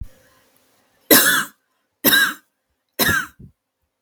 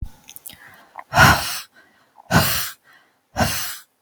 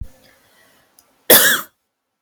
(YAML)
three_cough_length: 4.0 s
three_cough_amplitude: 32768
three_cough_signal_mean_std_ratio: 0.37
exhalation_length: 4.0 s
exhalation_amplitude: 32768
exhalation_signal_mean_std_ratio: 0.4
cough_length: 2.2 s
cough_amplitude: 32768
cough_signal_mean_std_ratio: 0.31
survey_phase: beta (2021-08-13 to 2022-03-07)
age: 18-44
gender: Female
wearing_mask: 'No'
symptom_none: true
smoker_status: Never smoked
respiratory_condition_asthma: false
respiratory_condition_other: false
recruitment_source: REACT
submission_delay: 2 days
covid_test_result: Negative
covid_test_method: RT-qPCR
influenza_a_test_result: Unknown/Void
influenza_b_test_result: Unknown/Void